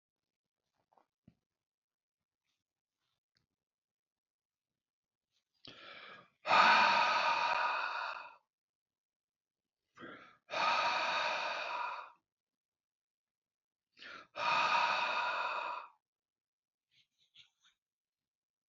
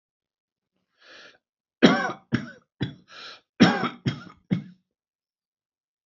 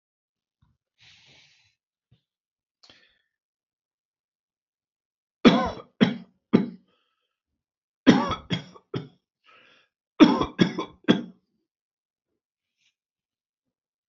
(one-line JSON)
{"exhalation_length": "18.7 s", "exhalation_amplitude": 6680, "exhalation_signal_mean_std_ratio": 0.39, "cough_length": "6.1 s", "cough_amplitude": 26316, "cough_signal_mean_std_ratio": 0.28, "three_cough_length": "14.1 s", "three_cough_amplitude": 28472, "three_cough_signal_mean_std_ratio": 0.22, "survey_phase": "alpha (2021-03-01 to 2021-08-12)", "age": "65+", "gender": "Male", "wearing_mask": "No", "symptom_none": true, "smoker_status": "Ex-smoker", "respiratory_condition_asthma": false, "respiratory_condition_other": false, "recruitment_source": "REACT", "submission_delay": "9 days", "covid_test_result": "Negative", "covid_test_method": "RT-qPCR"}